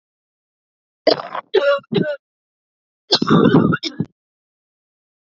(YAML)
cough_length: 5.2 s
cough_amplitude: 30646
cough_signal_mean_std_ratio: 0.4
survey_phase: beta (2021-08-13 to 2022-03-07)
age: 45-64
gender: Female
wearing_mask: 'No'
symptom_cough_any: true
symptom_runny_or_blocked_nose: true
symptom_sore_throat: true
symptom_fatigue: true
symptom_onset: 2 days
smoker_status: Never smoked
respiratory_condition_asthma: false
respiratory_condition_other: false
recruitment_source: Test and Trace
submission_delay: 0 days
covid_test_result: Positive
covid_test_method: ePCR